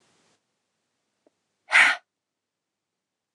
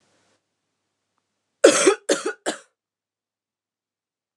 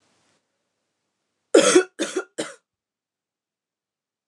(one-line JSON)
{"exhalation_length": "3.3 s", "exhalation_amplitude": 23375, "exhalation_signal_mean_std_ratio": 0.2, "cough_length": "4.4 s", "cough_amplitude": 29204, "cough_signal_mean_std_ratio": 0.24, "three_cough_length": "4.3 s", "three_cough_amplitude": 26183, "three_cough_signal_mean_std_ratio": 0.24, "survey_phase": "alpha (2021-03-01 to 2021-08-12)", "age": "18-44", "gender": "Female", "wearing_mask": "No", "symptom_cough_any": true, "symptom_shortness_of_breath": true, "symptom_fatigue": true, "symptom_headache": true, "symptom_change_to_sense_of_smell_or_taste": true, "symptom_loss_of_taste": true, "symptom_onset": "3 days", "smoker_status": "Never smoked", "respiratory_condition_asthma": false, "respiratory_condition_other": false, "recruitment_source": "Test and Trace", "submission_delay": "2 days", "covid_test_result": "Positive", "covid_test_method": "RT-qPCR", "covid_ct_value": 15.4, "covid_ct_gene": "N gene", "covid_ct_mean": 15.4, "covid_viral_load": "8700000 copies/ml", "covid_viral_load_category": "High viral load (>1M copies/ml)"}